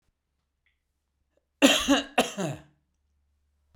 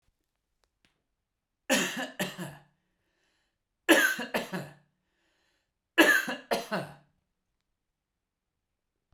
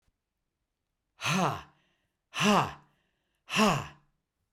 cough_length: 3.8 s
cough_amplitude: 24221
cough_signal_mean_std_ratio: 0.3
three_cough_length: 9.1 s
three_cough_amplitude: 15467
three_cough_signal_mean_std_ratio: 0.3
exhalation_length: 4.5 s
exhalation_amplitude: 8272
exhalation_signal_mean_std_ratio: 0.38
survey_phase: beta (2021-08-13 to 2022-03-07)
age: 65+
gender: Male
wearing_mask: 'No'
symptom_none: true
smoker_status: Never smoked
respiratory_condition_asthma: false
respiratory_condition_other: false
recruitment_source: Test and Trace
submission_delay: -1 day
covid_test_result: Negative
covid_test_method: LFT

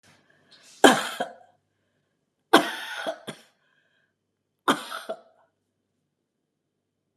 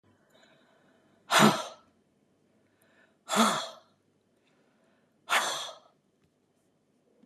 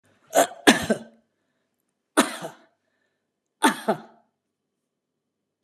three_cough_length: 7.2 s
three_cough_amplitude: 31164
three_cough_signal_mean_std_ratio: 0.23
exhalation_length: 7.3 s
exhalation_amplitude: 14650
exhalation_signal_mean_std_ratio: 0.28
cough_length: 5.6 s
cough_amplitude: 32767
cough_signal_mean_std_ratio: 0.26
survey_phase: beta (2021-08-13 to 2022-03-07)
age: 65+
gender: Female
wearing_mask: 'No'
symptom_runny_or_blocked_nose: true
smoker_status: Ex-smoker
respiratory_condition_asthma: false
respiratory_condition_other: false
recruitment_source: REACT
submission_delay: 3 days
covid_test_result: Negative
covid_test_method: RT-qPCR
influenza_a_test_result: Negative
influenza_b_test_result: Negative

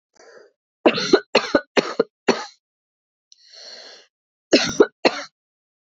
cough_length: 5.9 s
cough_amplitude: 27577
cough_signal_mean_std_ratio: 0.31
survey_phase: beta (2021-08-13 to 2022-03-07)
age: 45-64
gender: Female
wearing_mask: 'No'
symptom_cough_any: true
symptom_runny_or_blocked_nose: true
symptom_shortness_of_breath: true
symptom_sore_throat: true
symptom_fatigue: true
symptom_fever_high_temperature: true
symptom_headache: true
symptom_other: true
symptom_onset: 4 days
smoker_status: Never smoked
respiratory_condition_asthma: true
respiratory_condition_other: false
recruitment_source: Test and Trace
submission_delay: 2 days
covid_test_result: Positive
covid_test_method: RT-qPCR
covid_ct_value: 22.5
covid_ct_gene: ORF1ab gene
covid_ct_mean: 23.1
covid_viral_load: 26000 copies/ml
covid_viral_load_category: Low viral load (10K-1M copies/ml)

